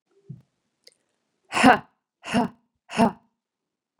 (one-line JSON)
{"exhalation_length": "4.0 s", "exhalation_amplitude": 31092, "exhalation_signal_mean_std_ratio": 0.26, "survey_phase": "beta (2021-08-13 to 2022-03-07)", "age": "45-64", "gender": "Female", "wearing_mask": "No", "symptom_cough_any": true, "symptom_runny_or_blocked_nose": true, "symptom_headache": true, "symptom_onset": "4 days", "smoker_status": "Never smoked", "respiratory_condition_asthma": false, "respiratory_condition_other": false, "recruitment_source": "Test and Trace", "submission_delay": "2 days", "covid_test_result": "Positive", "covid_test_method": "ePCR"}